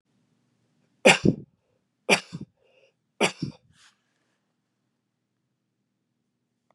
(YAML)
three_cough_length: 6.7 s
three_cough_amplitude: 28166
three_cough_signal_mean_std_ratio: 0.19
survey_phase: beta (2021-08-13 to 2022-03-07)
age: 45-64
gender: Male
wearing_mask: 'No'
symptom_other: true
symptom_onset: 3 days
smoker_status: Ex-smoker
respiratory_condition_asthma: false
respiratory_condition_other: false
recruitment_source: REACT
submission_delay: 1 day
covid_test_result: Negative
covid_test_method: RT-qPCR
influenza_a_test_result: Negative
influenza_b_test_result: Negative